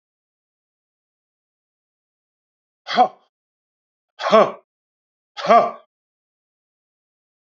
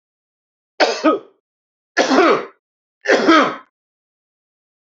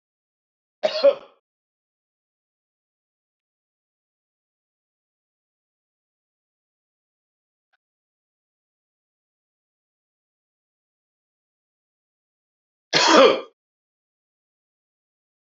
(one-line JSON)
{"exhalation_length": "7.6 s", "exhalation_amplitude": 30647, "exhalation_signal_mean_std_ratio": 0.22, "three_cough_length": "4.9 s", "three_cough_amplitude": 28292, "three_cough_signal_mean_std_ratio": 0.4, "cough_length": "15.5 s", "cough_amplitude": 28064, "cough_signal_mean_std_ratio": 0.16, "survey_phase": "beta (2021-08-13 to 2022-03-07)", "age": "65+", "gender": "Male", "wearing_mask": "No", "symptom_none": true, "smoker_status": "Ex-smoker", "respiratory_condition_asthma": false, "respiratory_condition_other": false, "recruitment_source": "REACT", "submission_delay": "1 day", "covid_test_result": "Negative", "covid_test_method": "RT-qPCR", "influenza_a_test_result": "Negative", "influenza_b_test_result": "Negative"}